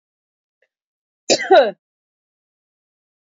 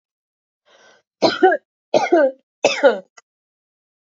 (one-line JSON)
{"cough_length": "3.2 s", "cough_amplitude": 27669, "cough_signal_mean_std_ratio": 0.24, "three_cough_length": "4.0 s", "three_cough_amplitude": 28894, "three_cough_signal_mean_std_ratio": 0.37, "survey_phase": "beta (2021-08-13 to 2022-03-07)", "age": "45-64", "gender": "Female", "wearing_mask": "No", "symptom_none": true, "smoker_status": "Ex-smoker", "respiratory_condition_asthma": false, "respiratory_condition_other": false, "recruitment_source": "REACT", "submission_delay": "2 days", "covid_test_result": "Negative", "covid_test_method": "RT-qPCR"}